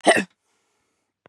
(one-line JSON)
{"cough_length": "1.3 s", "cough_amplitude": 24768, "cough_signal_mean_std_ratio": 0.27, "survey_phase": "beta (2021-08-13 to 2022-03-07)", "age": "45-64", "gender": "Female", "wearing_mask": "No", "symptom_none": true, "smoker_status": "Never smoked", "respiratory_condition_asthma": false, "respiratory_condition_other": false, "recruitment_source": "REACT", "submission_delay": "4 days", "covid_test_result": "Negative", "covid_test_method": "RT-qPCR", "influenza_a_test_result": "Unknown/Void", "influenza_b_test_result": "Unknown/Void"}